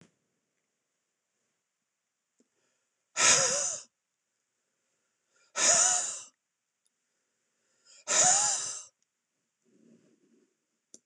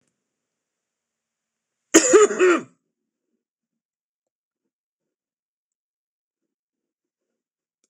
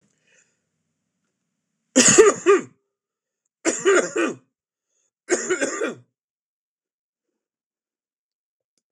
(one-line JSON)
{"exhalation_length": "11.1 s", "exhalation_amplitude": 10769, "exhalation_signal_mean_std_ratio": 0.32, "cough_length": "7.9 s", "cough_amplitude": 26028, "cough_signal_mean_std_ratio": 0.21, "three_cough_length": "8.9 s", "three_cough_amplitude": 26028, "three_cough_signal_mean_std_ratio": 0.31, "survey_phase": "beta (2021-08-13 to 2022-03-07)", "age": "65+", "gender": "Male", "wearing_mask": "No", "symptom_none": true, "smoker_status": "Never smoked", "respiratory_condition_asthma": false, "respiratory_condition_other": false, "recruitment_source": "REACT", "submission_delay": "1 day", "covid_test_result": "Negative", "covid_test_method": "RT-qPCR"}